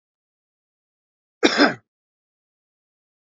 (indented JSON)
{
  "cough_length": "3.2 s",
  "cough_amplitude": 32768,
  "cough_signal_mean_std_ratio": 0.21,
  "survey_phase": "beta (2021-08-13 to 2022-03-07)",
  "age": "45-64",
  "gender": "Male",
  "wearing_mask": "No",
  "symptom_fatigue": true,
  "symptom_onset": "4 days",
  "smoker_status": "Never smoked",
  "respiratory_condition_asthma": false,
  "respiratory_condition_other": false,
  "recruitment_source": "REACT",
  "submission_delay": "1 day",
  "covid_test_result": "Negative",
  "covid_test_method": "RT-qPCR",
  "influenza_a_test_result": "Negative",
  "influenza_b_test_result": "Negative"
}